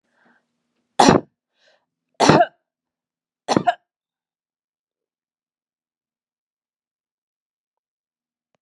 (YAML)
three_cough_length: 8.6 s
three_cough_amplitude: 32768
three_cough_signal_mean_std_ratio: 0.2
survey_phase: beta (2021-08-13 to 2022-03-07)
age: 65+
gender: Female
wearing_mask: 'No'
symptom_none: true
smoker_status: Ex-smoker
respiratory_condition_asthma: false
respiratory_condition_other: false
recruitment_source: REACT
submission_delay: 2 days
covid_test_result: Negative
covid_test_method: RT-qPCR